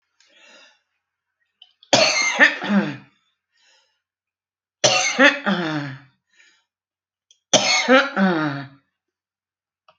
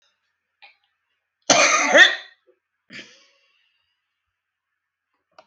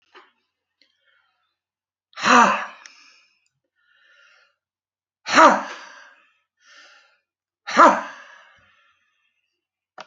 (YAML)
three_cough_length: 10.0 s
three_cough_amplitude: 32202
three_cough_signal_mean_std_ratio: 0.4
cough_length: 5.5 s
cough_amplitude: 29299
cough_signal_mean_std_ratio: 0.26
exhalation_length: 10.1 s
exhalation_amplitude: 29094
exhalation_signal_mean_std_ratio: 0.25
survey_phase: beta (2021-08-13 to 2022-03-07)
age: 65+
gender: Female
wearing_mask: 'No'
symptom_none: true
smoker_status: Current smoker (11 or more cigarettes per day)
respiratory_condition_asthma: false
respiratory_condition_other: true
recruitment_source: REACT
submission_delay: 2 days
covid_test_result: Negative
covid_test_method: RT-qPCR
influenza_a_test_result: Negative
influenza_b_test_result: Negative